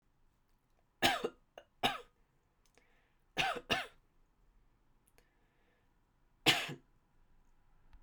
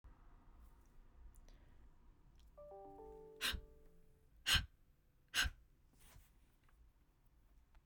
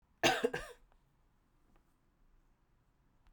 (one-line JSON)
{"three_cough_length": "8.0 s", "three_cough_amplitude": 7655, "three_cough_signal_mean_std_ratio": 0.27, "exhalation_length": "7.9 s", "exhalation_amplitude": 3781, "exhalation_signal_mean_std_ratio": 0.32, "cough_length": "3.3 s", "cough_amplitude": 6108, "cough_signal_mean_std_ratio": 0.25, "survey_phase": "beta (2021-08-13 to 2022-03-07)", "age": "45-64", "gender": "Female", "wearing_mask": "No", "symptom_none": true, "smoker_status": "Never smoked", "respiratory_condition_asthma": false, "respiratory_condition_other": false, "recruitment_source": "REACT", "submission_delay": "0 days", "covid_test_result": "Negative", "covid_test_method": "RT-qPCR"}